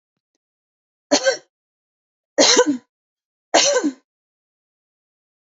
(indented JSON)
{
  "three_cough_length": "5.5 s",
  "three_cough_amplitude": 28703,
  "three_cough_signal_mean_std_ratio": 0.32,
  "survey_phase": "beta (2021-08-13 to 2022-03-07)",
  "age": "18-44",
  "gender": "Female",
  "wearing_mask": "No",
  "symptom_none": true,
  "smoker_status": "Never smoked",
  "respiratory_condition_asthma": false,
  "respiratory_condition_other": false,
  "recruitment_source": "REACT",
  "submission_delay": "1 day",
  "covid_test_result": "Negative",
  "covid_test_method": "RT-qPCR"
}